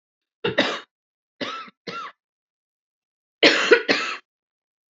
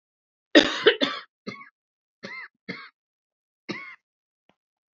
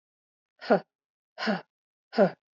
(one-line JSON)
{"three_cough_length": "4.9 s", "three_cough_amplitude": 30131, "three_cough_signal_mean_std_ratio": 0.33, "cough_length": "4.9 s", "cough_amplitude": 26887, "cough_signal_mean_std_ratio": 0.24, "exhalation_length": "2.6 s", "exhalation_amplitude": 12980, "exhalation_signal_mean_std_ratio": 0.29, "survey_phase": "beta (2021-08-13 to 2022-03-07)", "age": "45-64", "gender": "Female", "wearing_mask": "No", "symptom_cough_any": true, "symptom_onset": "3 days", "smoker_status": "Never smoked", "respiratory_condition_asthma": false, "respiratory_condition_other": false, "recruitment_source": "Test and Trace", "submission_delay": "1 day", "covid_test_result": "Negative", "covid_test_method": "RT-qPCR"}